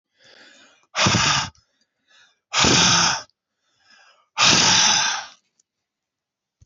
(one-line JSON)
{"exhalation_length": "6.7 s", "exhalation_amplitude": 23691, "exhalation_signal_mean_std_ratio": 0.47, "survey_phase": "alpha (2021-03-01 to 2021-08-12)", "age": "65+", "gender": "Male", "wearing_mask": "No", "symptom_cough_any": true, "symptom_onset": "3 days", "smoker_status": "Ex-smoker", "respiratory_condition_asthma": false, "respiratory_condition_other": false, "recruitment_source": "Test and Trace", "submission_delay": "2 days", "covid_test_result": "Positive", "covid_test_method": "RT-qPCR"}